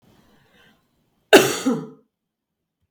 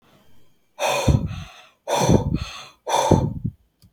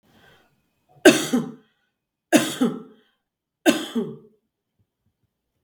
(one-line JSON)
{"cough_length": "2.9 s", "cough_amplitude": 32766, "cough_signal_mean_std_ratio": 0.25, "exhalation_length": "3.9 s", "exhalation_amplitude": 29016, "exhalation_signal_mean_std_ratio": 0.53, "three_cough_length": "5.6 s", "three_cough_amplitude": 32768, "three_cough_signal_mean_std_ratio": 0.29, "survey_phase": "beta (2021-08-13 to 2022-03-07)", "age": "45-64", "gender": "Female", "wearing_mask": "No", "symptom_none": true, "smoker_status": "Never smoked", "respiratory_condition_asthma": false, "respiratory_condition_other": false, "recruitment_source": "REACT", "submission_delay": "1 day", "covid_test_result": "Negative", "covid_test_method": "RT-qPCR", "influenza_a_test_result": "Negative", "influenza_b_test_result": "Negative"}